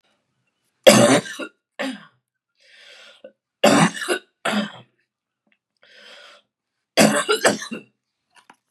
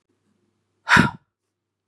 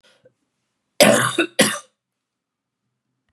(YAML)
three_cough_length: 8.7 s
three_cough_amplitude: 32768
three_cough_signal_mean_std_ratio: 0.33
exhalation_length: 1.9 s
exhalation_amplitude: 25022
exhalation_signal_mean_std_ratio: 0.25
cough_length: 3.3 s
cough_amplitude: 32768
cough_signal_mean_std_ratio: 0.31
survey_phase: beta (2021-08-13 to 2022-03-07)
age: 45-64
gender: Female
wearing_mask: 'No'
symptom_runny_or_blocked_nose: true
symptom_fatigue: true
symptom_headache: true
symptom_onset: 2 days
smoker_status: Ex-smoker
respiratory_condition_asthma: false
respiratory_condition_other: false
recruitment_source: Test and Trace
submission_delay: 1 day
covid_test_result: Positive
covid_test_method: RT-qPCR
covid_ct_value: 28.8
covid_ct_gene: N gene
covid_ct_mean: 31.3
covid_viral_load: 52 copies/ml
covid_viral_load_category: Minimal viral load (< 10K copies/ml)